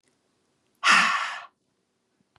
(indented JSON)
{
  "exhalation_length": "2.4 s",
  "exhalation_amplitude": 19570,
  "exhalation_signal_mean_std_ratio": 0.35,
  "survey_phase": "beta (2021-08-13 to 2022-03-07)",
  "age": "18-44",
  "gender": "Female",
  "wearing_mask": "No",
  "symptom_none": true,
  "smoker_status": "Never smoked",
  "respiratory_condition_asthma": false,
  "respiratory_condition_other": false,
  "recruitment_source": "REACT",
  "submission_delay": "0 days",
  "covid_test_result": "Negative",
  "covid_test_method": "RT-qPCR",
  "influenza_a_test_result": "Negative",
  "influenza_b_test_result": "Negative"
}